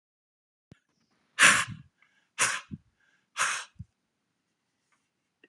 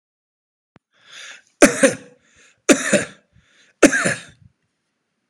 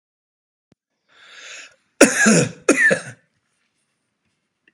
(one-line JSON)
{"exhalation_length": "5.5 s", "exhalation_amplitude": 19648, "exhalation_signal_mean_std_ratio": 0.25, "three_cough_length": "5.3 s", "three_cough_amplitude": 32768, "three_cough_signal_mean_std_ratio": 0.29, "cough_length": "4.7 s", "cough_amplitude": 32768, "cough_signal_mean_std_ratio": 0.32, "survey_phase": "beta (2021-08-13 to 2022-03-07)", "age": "45-64", "gender": "Male", "wearing_mask": "No", "symptom_none": true, "smoker_status": "Ex-smoker", "respiratory_condition_asthma": false, "respiratory_condition_other": false, "recruitment_source": "REACT", "submission_delay": "1 day", "covid_test_result": "Negative", "covid_test_method": "RT-qPCR", "influenza_a_test_result": "Unknown/Void", "influenza_b_test_result": "Unknown/Void"}